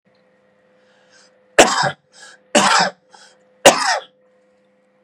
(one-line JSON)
{"three_cough_length": "5.0 s", "three_cough_amplitude": 32768, "three_cough_signal_mean_std_ratio": 0.33, "survey_phase": "beta (2021-08-13 to 2022-03-07)", "age": "45-64", "gender": "Male", "wearing_mask": "No", "symptom_none": true, "smoker_status": "Never smoked", "respiratory_condition_asthma": false, "respiratory_condition_other": false, "recruitment_source": "REACT", "submission_delay": "2 days", "covid_test_result": "Negative", "covid_test_method": "RT-qPCR", "influenza_a_test_result": "Negative", "influenza_b_test_result": "Negative"}